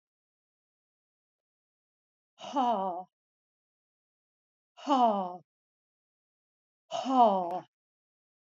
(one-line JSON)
{"exhalation_length": "8.4 s", "exhalation_amplitude": 9441, "exhalation_signal_mean_std_ratio": 0.32, "survey_phase": "alpha (2021-03-01 to 2021-08-12)", "age": "65+", "gender": "Female", "wearing_mask": "No", "symptom_cough_any": true, "symptom_onset": "12 days", "smoker_status": "Never smoked", "respiratory_condition_asthma": false, "respiratory_condition_other": false, "recruitment_source": "REACT", "submission_delay": "3 days", "covid_test_result": "Negative", "covid_test_method": "RT-qPCR"}